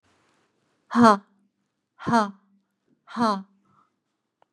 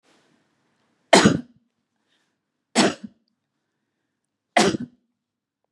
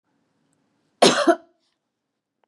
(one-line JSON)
{"exhalation_length": "4.5 s", "exhalation_amplitude": 29560, "exhalation_signal_mean_std_ratio": 0.27, "three_cough_length": "5.7 s", "three_cough_amplitude": 32767, "three_cough_signal_mean_std_ratio": 0.25, "cough_length": "2.5 s", "cough_amplitude": 31258, "cough_signal_mean_std_ratio": 0.26, "survey_phase": "beta (2021-08-13 to 2022-03-07)", "age": "45-64", "gender": "Female", "wearing_mask": "No", "symptom_none": true, "smoker_status": "Never smoked", "respiratory_condition_asthma": false, "respiratory_condition_other": false, "recruitment_source": "REACT", "submission_delay": "2 days", "covid_test_result": "Negative", "covid_test_method": "RT-qPCR", "influenza_a_test_result": "Negative", "influenza_b_test_result": "Negative"}